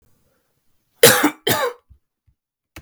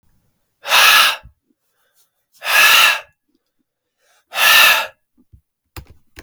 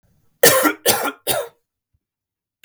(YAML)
cough_length: 2.8 s
cough_amplitude: 32768
cough_signal_mean_std_ratio: 0.3
exhalation_length: 6.2 s
exhalation_amplitude: 32768
exhalation_signal_mean_std_ratio: 0.41
three_cough_length: 2.6 s
three_cough_amplitude: 32768
three_cough_signal_mean_std_ratio: 0.39
survey_phase: beta (2021-08-13 to 2022-03-07)
age: 18-44
gender: Male
wearing_mask: 'No'
symptom_cough_any: true
symptom_new_continuous_cough: true
symptom_runny_or_blocked_nose: true
symptom_sore_throat: true
symptom_diarrhoea: true
symptom_headache: true
symptom_onset: 3 days
smoker_status: Never smoked
respiratory_condition_asthma: false
respiratory_condition_other: false
recruitment_source: Test and Trace
submission_delay: 2 days
covid_test_result: Positive
covid_test_method: ePCR